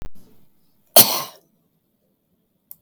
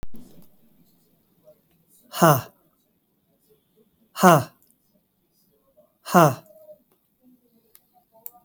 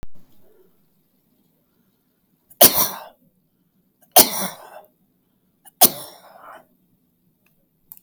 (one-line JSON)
{"cough_length": "2.8 s", "cough_amplitude": 32768, "cough_signal_mean_std_ratio": 0.23, "exhalation_length": "8.4 s", "exhalation_amplitude": 31948, "exhalation_signal_mean_std_ratio": 0.23, "three_cough_length": "8.0 s", "three_cough_amplitude": 32768, "three_cough_signal_mean_std_ratio": 0.22, "survey_phase": "beta (2021-08-13 to 2022-03-07)", "age": "65+", "gender": "Male", "wearing_mask": "No", "symptom_none": true, "smoker_status": "Never smoked", "respiratory_condition_asthma": false, "respiratory_condition_other": true, "recruitment_source": "REACT", "submission_delay": "10 days", "covid_test_method": "RT-qPCR", "influenza_a_test_result": "Unknown/Void", "influenza_b_test_result": "Unknown/Void"}